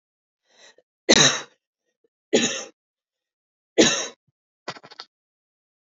{"three_cough_length": "5.8 s", "three_cough_amplitude": 27442, "three_cough_signal_mean_std_ratio": 0.27, "survey_phase": "beta (2021-08-13 to 2022-03-07)", "age": "18-44", "gender": "Female", "wearing_mask": "No", "symptom_abdominal_pain": true, "smoker_status": "Never smoked", "respiratory_condition_asthma": false, "respiratory_condition_other": false, "recruitment_source": "REACT", "submission_delay": "1 day", "covid_test_result": "Negative", "covid_test_method": "RT-qPCR", "influenza_a_test_result": "Negative", "influenza_b_test_result": "Negative"}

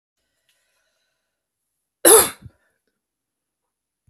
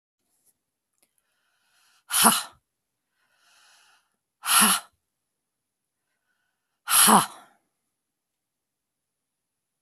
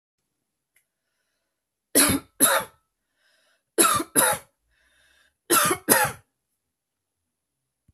{"cough_length": "4.1 s", "cough_amplitude": 32768, "cough_signal_mean_std_ratio": 0.18, "exhalation_length": "9.8 s", "exhalation_amplitude": 26188, "exhalation_signal_mean_std_ratio": 0.24, "three_cough_length": "7.9 s", "three_cough_amplitude": 29576, "three_cough_signal_mean_std_ratio": 0.33, "survey_phase": "beta (2021-08-13 to 2022-03-07)", "age": "45-64", "gender": "Female", "wearing_mask": "No", "symptom_none": true, "symptom_onset": "3 days", "smoker_status": "Ex-smoker", "respiratory_condition_asthma": false, "respiratory_condition_other": false, "recruitment_source": "REACT", "submission_delay": "1 day", "covid_test_result": "Negative", "covid_test_method": "RT-qPCR", "influenza_a_test_result": "Negative", "influenza_b_test_result": "Negative"}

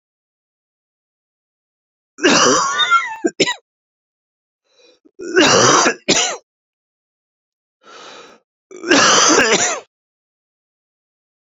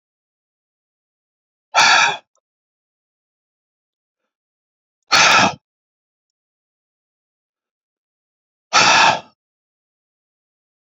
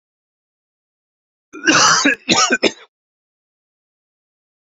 {"three_cough_length": "11.5 s", "three_cough_amplitude": 32768, "three_cough_signal_mean_std_ratio": 0.41, "exhalation_length": "10.8 s", "exhalation_amplitude": 32767, "exhalation_signal_mean_std_ratio": 0.27, "cough_length": "4.6 s", "cough_amplitude": 31075, "cough_signal_mean_std_ratio": 0.35, "survey_phase": "beta (2021-08-13 to 2022-03-07)", "age": "45-64", "gender": "Male", "wearing_mask": "No", "symptom_headache": true, "smoker_status": "Never smoked", "respiratory_condition_asthma": false, "respiratory_condition_other": false, "recruitment_source": "REACT", "submission_delay": "11 days", "covid_test_result": "Negative", "covid_test_method": "RT-qPCR"}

